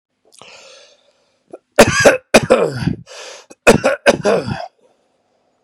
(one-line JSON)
{"cough_length": "5.6 s", "cough_amplitude": 32768, "cough_signal_mean_std_ratio": 0.38, "survey_phase": "beta (2021-08-13 to 2022-03-07)", "age": "45-64", "gender": "Male", "wearing_mask": "No", "symptom_none": true, "smoker_status": "Ex-smoker", "respiratory_condition_asthma": true, "respiratory_condition_other": true, "recruitment_source": "REACT", "submission_delay": "6 days", "covid_test_result": "Negative", "covid_test_method": "RT-qPCR", "influenza_a_test_result": "Negative", "influenza_b_test_result": "Negative"}